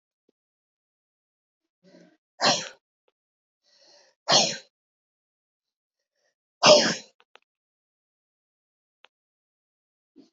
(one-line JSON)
{"exhalation_length": "10.3 s", "exhalation_amplitude": 26184, "exhalation_signal_mean_std_ratio": 0.2, "survey_phase": "beta (2021-08-13 to 2022-03-07)", "age": "18-44", "gender": "Female", "wearing_mask": "No", "symptom_runny_or_blocked_nose": true, "symptom_shortness_of_breath": true, "symptom_sore_throat": true, "symptom_abdominal_pain": true, "symptom_fatigue": true, "symptom_headache": true, "smoker_status": "Ex-smoker", "respiratory_condition_asthma": false, "respiratory_condition_other": false, "recruitment_source": "Test and Trace", "submission_delay": "2 days", "covid_test_result": "Positive", "covid_test_method": "RT-qPCR", "covid_ct_value": 16.4, "covid_ct_gene": "ORF1ab gene", "covid_ct_mean": 16.4, "covid_viral_load": "4000000 copies/ml", "covid_viral_load_category": "High viral load (>1M copies/ml)"}